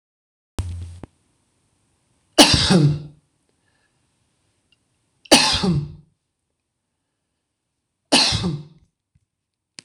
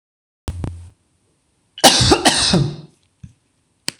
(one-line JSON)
{"three_cough_length": "9.8 s", "three_cough_amplitude": 26028, "three_cough_signal_mean_std_ratio": 0.32, "cough_length": "4.0 s", "cough_amplitude": 26028, "cough_signal_mean_std_ratio": 0.4, "survey_phase": "beta (2021-08-13 to 2022-03-07)", "age": "45-64", "gender": "Male", "wearing_mask": "No", "symptom_none": true, "smoker_status": "Never smoked", "respiratory_condition_asthma": false, "respiratory_condition_other": false, "recruitment_source": "REACT", "submission_delay": "2 days", "covid_test_result": "Negative", "covid_test_method": "RT-qPCR"}